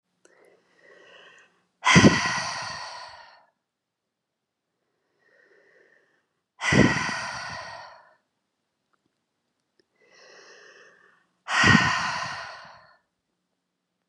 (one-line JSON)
{"exhalation_length": "14.1 s", "exhalation_amplitude": 26908, "exhalation_signal_mean_std_ratio": 0.3, "survey_phase": "beta (2021-08-13 to 2022-03-07)", "age": "18-44", "gender": "Female", "wearing_mask": "No", "symptom_none": true, "smoker_status": "Current smoker (11 or more cigarettes per day)", "respiratory_condition_asthma": true, "respiratory_condition_other": false, "recruitment_source": "REACT", "submission_delay": "1 day", "covid_test_result": "Negative", "covid_test_method": "RT-qPCR", "influenza_a_test_result": "Negative", "influenza_b_test_result": "Negative"}